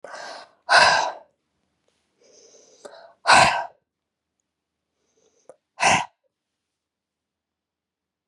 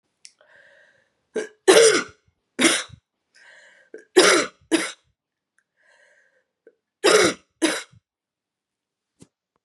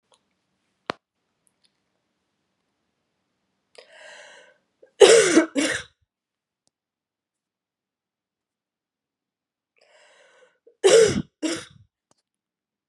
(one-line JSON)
{"exhalation_length": "8.3 s", "exhalation_amplitude": 27972, "exhalation_signal_mean_std_ratio": 0.28, "three_cough_length": "9.6 s", "three_cough_amplitude": 30979, "three_cough_signal_mean_std_ratio": 0.31, "cough_length": "12.9 s", "cough_amplitude": 32721, "cough_signal_mean_std_ratio": 0.22, "survey_phase": "beta (2021-08-13 to 2022-03-07)", "age": "45-64", "gender": "Female", "wearing_mask": "No", "symptom_cough_any": true, "symptom_runny_or_blocked_nose": true, "symptom_sore_throat": true, "symptom_diarrhoea": true, "symptom_fatigue": true, "symptom_change_to_sense_of_smell_or_taste": true, "smoker_status": "Never smoked", "respiratory_condition_asthma": false, "respiratory_condition_other": false, "recruitment_source": "Test and Trace", "submission_delay": "2 days", "covid_test_result": "Positive", "covid_test_method": "RT-qPCR"}